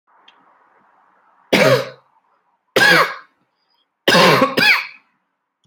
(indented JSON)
{
  "three_cough_length": "5.7 s",
  "three_cough_amplitude": 30775,
  "three_cough_signal_mean_std_ratio": 0.41,
  "survey_phase": "beta (2021-08-13 to 2022-03-07)",
  "age": "18-44",
  "gender": "Male",
  "wearing_mask": "No",
  "symptom_sore_throat": true,
  "symptom_fatigue": true,
  "symptom_headache": true,
  "smoker_status": "Current smoker (e-cigarettes or vapes only)",
  "respiratory_condition_asthma": false,
  "respiratory_condition_other": false,
  "recruitment_source": "REACT",
  "submission_delay": "2 days",
  "covid_test_result": "Negative",
  "covid_test_method": "RT-qPCR"
}